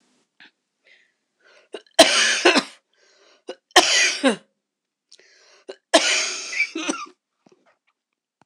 {"three_cough_length": "8.5 s", "three_cough_amplitude": 26028, "three_cough_signal_mean_std_ratio": 0.35, "survey_phase": "beta (2021-08-13 to 2022-03-07)", "age": "45-64", "gender": "Female", "wearing_mask": "No", "symptom_cough_any": true, "symptom_new_continuous_cough": true, "symptom_runny_or_blocked_nose": true, "symptom_shortness_of_breath": true, "symptom_fatigue": true, "symptom_headache": true, "symptom_change_to_sense_of_smell_or_taste": true, "symptom_onset": "3 days", "smoker_status": "Never smoked", "respiratory_condition_asthma": true, "respiratory_condition_other": false, "recruitment_source": "Test and Trace", "submission_delay": "2 days", "covid_test_result": "Positive", "covid_test_method": "RT-qPCR", "covid_ct_value": 23.2, "covid_ct_gene": "ORF1ab gene"}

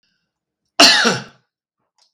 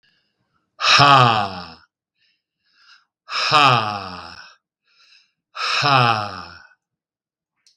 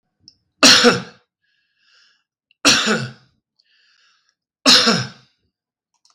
{"cough_length": "2.1 s", "cough_amplitude": 32768, "cough_signal_mean_std_ratio": 0.33, "exhalation_length": "7.8 s", "exhalation_amplitude": 32768, "exhalation_signal_mean_std_ratio": 0.4, "three_cough_length": "6.1 s", "three_cough_amplitude": 32768, "three_cough_signal_mean_std_ratio": 0.34, "survey_phase": "beta (2021-08-13 to 2022-03-07)", "age": "65+", "gender": "Male", "wearing_mask": "No", "symptom_none": true, "smoker_status": "Never smoked", "respiratory_condition_asthma": false, "respiratory_condition_other": false, "recruitment_source": "REACT", "submission_delay": "1 day", "covid_test_result": "Negative", "covid_test_method": "RT-qPCR", "influenza_a_test_result": "Unknown/Void", "influenza_b_test_result": "Unknown/Void"}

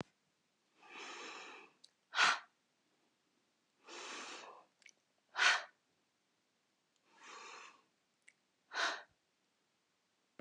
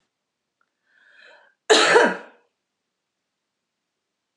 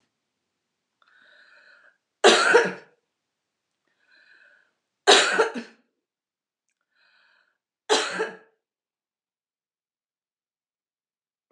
{"exhalation_length": "10.4 s", "exhalation_amplitude": 5201, "exhalation_signal_mean_std_ratio": 0.27, "cough_length": "4.4 s", "cough_amplitude": 27903, "cough_signal_mean_std_ratio": 0.26, "three_cough_length": "11.5 s", "three_cough_amplitude": 29414, "three_cough_signal_mean_std_ratio": 0.24, "survey_phase": "beta (2021-08-13 to 2022-03-07)", "age": "45-64", "gender": "Female", "wearing_mask": "No", "symptom_runny_or_blocked_nose": true, "smoker_status": "Ex-smoker", "respiratory_condition_asthma": false, "respiratory_condition_other": false, "recruitment_source": "REACT", "submission_delay": "2 days", "covid_test_result": "Negative", "covid_test_method": "RT-qPCR", "influenza_a_test_result": "Negative", "influenza_b_test_result": "Negative"}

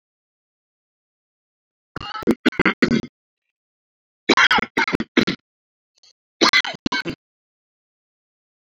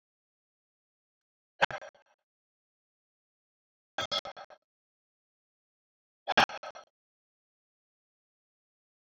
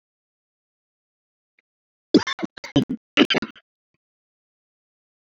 {"three_cough_length": "8.6 s", "three_cough_amplitude": 32768, "three_cough_signal_mean_std_ratio": 0.3, "exhalation_length": "9.1 s", "exhalation_amplitude": 11309, "exhalation_signal_mean_std_ratio": 0.15, "cough_length": "5.2 s", "cough_amplitude": 28747, "cough_signal_mean_std_ratio": 0.21, "survey_phase": "alpha (2021-03-01 to 2021-08-12)", "age": "45-64", "gender": "Male", "wearing_mask": "No", "symptom_none": true, "smoker_status": "Ex-smoker", "respiratory_condition_asthma": false, "respiratory_condition_other": false, "recruitment_source": "REACT", "submission_delay": "1 day", "covid_test_result": "Negative", "covid_test_method": "RT-qPCR"}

